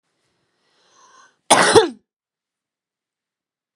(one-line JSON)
{"cough_length": "3.8 s", "cough_amplitude": 32768, "cough_signal_mean_std_ratio": 0.24, "survey_phase": "beta (2021-08-13 to 2022-03-07)", "age": "18-44", "gender": "Female", "wearing_mask": "No", "symptom_none": true, "smoker_status": "Current smoker (11 or more cigarettes per day)", "respiratory_condition_asthma": true, "respiratory_condition_other": false, "recruitment_source": "REACT", "submission_delay": "1 day", "covid_test_result": "Negative", "covid_test_method": "RT-qPCR", "influenza_a_test_result": "Negative", "influenza_b_test_result": "Negative"}